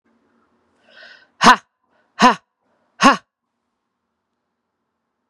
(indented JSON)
{
  "exhalation_length": "5.3 s",
  "exhalation_amplitude": 32768,
  "exhalation_signal_mean_std_ratio": 0.21,
  "survey_phase": "beta (2021-08-13 to 2022-03-07)",
  "age": "18-44",
  "gender": "Female",
  "wearing_mask": "No",
  "symptom_runny_or_blocked_nose": true,
  "symptom_sore_throat": true,
  "symptom_fatigue": true,
  "symptom_other": true,
  "symptom_onset": "6 days",
  "smoker_status": "Ex-smoker",
  "respiratory_condition_asthma": false,
  "respiratory_condition_other": false,
  "recruitment_source": "Test and Trace",
  "submission_delay": "2 days",
  "covid_test_result": "Positive",
  "covid_test_method": "RT-qPCR",
  "covid_ct_value": 16.3,
  "covid_ct_gene": "N gene",
  "covid_ct_mean": 16.4,
  "covid_viral_load": "4300000 copies/ml",
  "covid_viral_load_category": "High viral load (>1M copies/ml)"
}